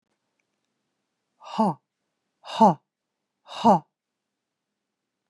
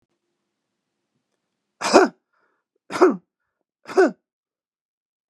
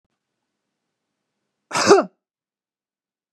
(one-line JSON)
{"exhalation_length": "5.3 s", "exhalation_amplitude": 18371, "exhalation_signal_mean_std_ratio": 0.24, "three_cough_length": "5.3 s", "three_cough_amplitude": 32767, "three_cough_signal_mean_std_ratio": 0.25, "cough_length": "3.3 s", "cough_amplitude": 31198, "cough_signal_mean_std_ratio": 0.22, "survey_phase": "beta (2021-08-13 to 2022-03-07)", "age": "45-64", "gender": "Female", "wearing_mask": "No", "symptom_none": true, "smoker_status": "Never smoked", "respiratory_condition_asthma": false, "respiratory_condition_other": false, "recruitment_source": "Test and Trace", "submission_delay": "2 days", "covid_test_result": "Negative", "covid_test_method": "RT-qPCR"}